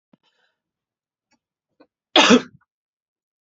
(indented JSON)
{
  "cough_length": "3.4 s",
  "cough_amplitude": 32195,
  "cough_signal_mean_std_ratio": 0.21,
  "survey_phase": "beta (2021-08-13 to 2022-03-07)",
  "age": "45-64",
  "gender": "Female",
  "wearing_mask": "No",
  "symptom_cough_any": true,
  "symptom_runny_or_blocked_nose": true,
  "symptom_sore_throat": true,
  "symptom_fatigue": true,
  "symptom_headache": true,
  "symptom_change_to_sense_of_smell_or_taste": true,
  "symptom_loss_of_taste": true,
  "symptom_other": true,
  "symptom_onset": "5 days",
  "smoker_status": "Never smoked",
  "respiratory_condition_asthma": false,
  "respiratory_condition_other": false,
  "recruitment_source": "Test and Trace",
  "submission_delay": "2 days",
  "covid_test_result": "Positive",
  "covid_test_method": "RT-qPCR",
  "covid_ct_value": 14.8,
  "covid_ct_gene": "ORF1ab gene",
  "covid_ct_mean": 15.8,
  "covid_viral_load": "6500000 copies/ml",
  "covid_viral_load_category": "High viral load (>1M copies/ml)"
}